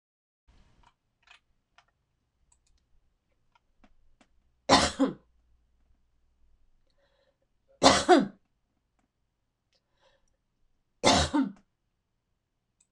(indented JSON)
{
  "three_cough_length": "12.9 s",
  "three_cough_amplitude": 23121,
  "three_cough_signal_mean_std_ratio": 0.22,
  "survey_phase": "beta (2021-08-13 to 2022-03-07)",
  "age": "65+",
  "gender": "Female",
  "wearing_mask": "No",
  "symptom_none": true,
  "smoker_status": "Ex-smoker",
  "respiratory_condition_asthma": false,
  "respiratory_condition_other": false,
  "recruitment_source": "REACT",
  "submission_delay": "5 days",
  "covid_test_result": "Negative",
  "covid_test_method": "RT-qPCR"
}